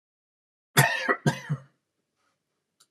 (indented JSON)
{
  "cough_length": "2.9 s",
  "cough_amplitude": 22121,
  "cough_signal_mean_std_ratio": 0.31,
  "survey_phase": "alpha (2021-03-01 to 2021-08-12)",
  "age": "65+",
  "gender": "Male",
  "wearing_mask": "No",
  "symptom_none": true,
  "smoker_status": "Ex-smoker",
  "respiratory_condition_asthma": true,
  "respiratory_condition_other": false,
  "recruitment_source": "REACT",
  "submission_delay": "2 days",
  "covid_test_result": "Negative",
  "covid_test_method": "RT-qPCR"
}